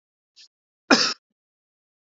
{"cough_length": "2.1 s", "cough_amplitude": 28742, "cough_signal_mean_std_ratio": 0.22, "survey_phase": "beta (2021-08-13 to 2022-03-07)", "age": "45-64", "gender": "Male", "wearing_mask": "No", "symptom_none": true, "smoker_status": "Never smoked", "respiratory_condition_asthma": false, "respiratory_condition_other": false, "recruitment_source": "REACT", "submission_delay": "1 day", "covid_test_result": "Negative", "covid_test_method": "RT-qPCR", "influenza_a_test_result": "Negative", "influenza_b_test_result": "Negative"}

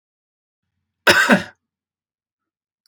{"cough_length": "2.9 s", "cough_amplitude": 32767, "cough_signal_mean_std_ratio": 0.26, "survey_phase": "beta (2021-08-13 to 2022-03-07)", "age": "45-64", "gender": "Male", "wearing_mask": "No", "symptom_none": true, "smoker_status": "Never smoked", "respiratory_condition_asthma": false, "respiratory_condition_other": false, "recruitment_source": "REACT", "submission_delay": "3 days", "covid_test_result": "Negative", "covid_test_method": "RT-qPCR", "influenza_a_test_result": "Negative", "influenza_b_test_result": "Negative"}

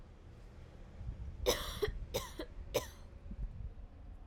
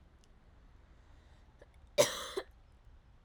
{"three_cough_length": "4.3 s", "three_cough_amplitude": 3863, "three_cough_signal_mean_std_ratio": 0.67, "cough_length": "3.2 s", "cough_amplitude": 8531, "cough_signal_mean_std_ratio": 0.27, "survey_phase": "alpha (2021-03-01 to 2021-08-12)", "age": "18-44", "gender": "Female", "wearing_mask": "No", "symptom_cough_any": true, "symptom_headache": true, "symptom_change_to_sense_of_smell_or_taste": true, "symptom_loss_of_taste": true, "symptom_onset": "3 days", "smoker_status": "Never smoked", "respiratory_condition_asthma": false, "respiratory_condition_other": false, "recruitment_source": "Test and Trace", "submission_delay": "1 day", "covid_test_result": "Positive", "covid_test_method": "RT-qPCR", "covid_ct_value": 17.9, "covid_ct_gene": "ORF1ab gene", "covid_ct_mean": 18.6, "covid_viral_load": "810000 copies/ml", "covid_viral_load_category": "Low viral load (10K-1M copies/ml)"}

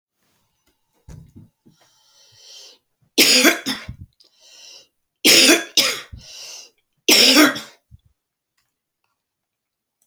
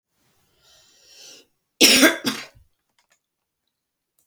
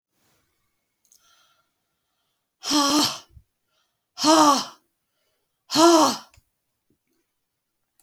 {"three_cough_length": "10.1 s", "three_cough_amplitude": 32768, "three_cough_signal_mean_std_ratio": 0.32, "cough_length": "4.3 s", "cough_amplitude": 32167, "cough_signal_mean_std_ratio": 0.25, "exhalation_length": "8.0 s", "exhalation_amplitude": 23241, "exhalation_signal_mean_std_ratio": 0.33, "survey_phase": "beta (2021-08-13 to 2022-03-07)", "age": "65+", "gender": "Female", "wearing_mask": "No", "symptom_cough_any": true, "symptom_new_continuous_cough": true, "symptom_runny_or_blocked_nose": true, "symptom_fatigue": true, "symptom_headache": true, "symptom_onset": "4 days", "smoker_status": "Never smoked", "respiratory_condition_asthma": false, "respiratory_condition_other": false, "recruitment_source": "Test and Trace", "submission_delay": "1 day", "covid_test_result": "Positive", "covid_test_method": "RT-qPCR"}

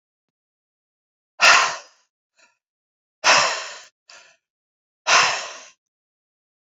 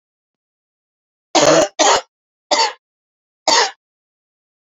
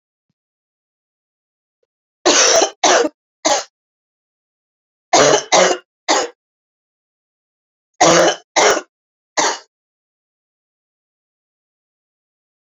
{"exhalation_length": "6.7 s", "exhalation_amplitude": 28142, "exhalation_signal_mean_std_ratio": 0.31, "cough_length": "4.7 s", "cough_amplitude": 32767, "cough_signal_mean_std_ratio": 0.36, "three_cough_length": "12.6 s", "three_cough_amplitude": 32768, "three_cough_signal_mean_std_ratio": 0.34, "survey_phase": "beta (2021-08-13 to 2022-03-07)", "age": "45-64", "gender": "Female", "wearing_mask": "No", "symptom_cough_any": true, "symptom_runny_or_blocked_nose": true, "symptom_sore_throat": true, "symptom_fatigue": true, "symptom_headache": true, "symptom_change_to_sense_of_smell_or_taste": true, "symptom_loss_of_taste": true, "symptom_onset": "3 days", "smoker_status": "Ex-smoker", "respiratory_condition_asthma": false, "respiratory_condition_other": false, "recruitment_source": "Test and Trace", "submission_delay": "2 days", "covid_test_result": "Positive", "covid_test_method": "RT-qPCR"}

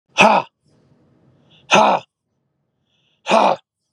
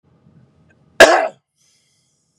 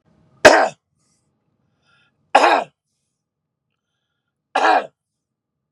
{"exhalation_length": "3.9 s", "exhalation_amplitude": 32768, "exhalation_signal_mean_std_ratio": 0.35, "cough_length": "2.4 s", "cough_amplitude": 32768, "cough_signal_mean_std_ratio": 0.25, "three_cough_length": "5.7 s", "three_cough_amplitude": 32768, "three_cough_signal_mean_std_ratio": 0.27, "survey_phase": "beta (2021-08-13 to 2022-03-07)", "age": "45-64", "gender": "Male", "wearing_mask": "No", "symptom_none": true, "smoker_status": "Ex-smoker", "respiratory_condition_asthma": false, "respiratory_condition_other": false, "recruitment_source": "REACT", "submission_delay": "1 day", "covid_test_result": "Negative", "covid_test_method": "RT-qPCR"}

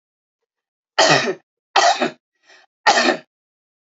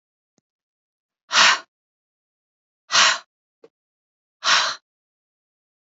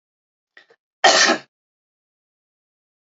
{"three_cough_length": "3.8 s", "three_cough_amplitude": 32308, "three_cough_signal_mean_std_ratio": 0.4, "exhalation_length": "5.8 s", "exhalation_amplitude": 26318, "exhalation_signal_mean_std_ratio": 0.28, "cough_length": "3.1 s", "cough_amplitude": 28640, "cough_signal_mean_std_ratio": 0.26, "survey_phase": "beta (2021-08-13 to 2022-03-07)", "age": "45-64", "gender": "Female", "wearing_mask": "No", "symptom_cough_any": true, "symptom_runny_or_blocked_nose": true, "symptom_sore_throat": true, "symptom_onset": "4 days", "smoker_status": "Never smoked", "respiratory_condition_asthma": false, "respiratory_condition_other": false, "recruitment_source": "Test and Trace", "submission_delay": "2 days", "covid_test_result": "Negative", "covid_test_method": "RT-qPCR"}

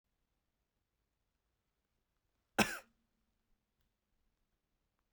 {"cough_length": "5.1 s", "cough_amplitude": 6481, "cough_signal_mean_std_ratio": 0.12, "survey_phase": "beta (2021-08-13 to 2022-03-07)", "age": "18-44", "gender": "Male", "wearing_mask": "No", "symptom_cough_any": true, "symptom_runny_or_blocked_nose": true, "symptom_fatigue": true, "symptom_headache": true, "symptom_change_to_sense_of_smell_or_taste": true, "symptom_onset": "5 days", "smoker_status": "Never smoked", "respiratory_condition_asthma": false, "respiratory_condition_other": false, "recruitment_source": "Test and Trace", "submission_delay": "1 day", "covid_test_result": "Positive", "covid_test_method": "RT-qPCR", "covid_ct_value": 19.6, "covid_ct_gene": "ORF1ab gene"}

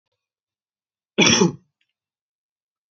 {"cough_length": "2.9 s", "cough_amplitude": 27565, "cough_signal_mean_std_ratio": 0.26, "survey_phase": "alpha (2021-03-01 to 2021-08-12)", "age": "18-44", "gender": "Male", "wearing_mask": "No", "symptom_cough_any": true, "symptom_new_continuous_cough": true, "symptom_abdominal_pain": true, "symptom_fatigue": true, "symptom_fever_high_temperature": true, "symptom_onset": "3 days", "smoker_status": "Never smoked", "respiratory_condition_asthma": false, "respiratory_condition_other": false, "recruitment_source": "Test and Trace", "submission_delay": "2 days", "covid_test_result": "Positive", "covid_test_method": "RT-qPCR", "covid_ct_value": 19.3, "covid_ct_gene": "ORF1ab gene", "covid_ct_mean": 20.4, "covid_viral_load": "210000 copies/ml", "covid_viral_load_category": "Low viral load (10K-1M copies/ml)"}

